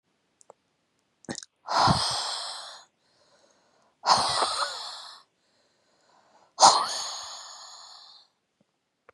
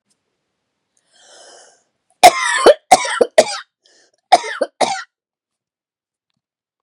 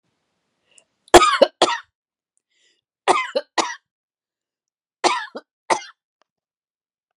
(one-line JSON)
{"exhalation_length": "9.1 s", "exhalation_amplitude": 24855, "exhalation_signal_mean_std_ratio": 0.35, "cough_length": "6.8 s", "cough_amplitude": 32768, "cough_signal_mean_std_ratio": 0.28, "three_cough_length": "7.2 s", "three_cough_amplitude": 32768, "three_cough_signal_mean_std_ratio": 0.25, "survey_phase": "beta (2021-08-13 to 2022-03-07)", "age": "45-64", "gender": "Female", "wearing_mask": "No", "symptom_headache": true, "smoker_status": "Never smoked", "respiratory_condition_asthma": false, "respiratory_condition_other": false, "recruitment_source": "REACT", "submission_delay": "8 days", "covid_test_result": "Negative", "covid_test_method": "RT-qPCR", "influenza_a_test_result": "Negative", "influenza_b_test_result": "Negative"}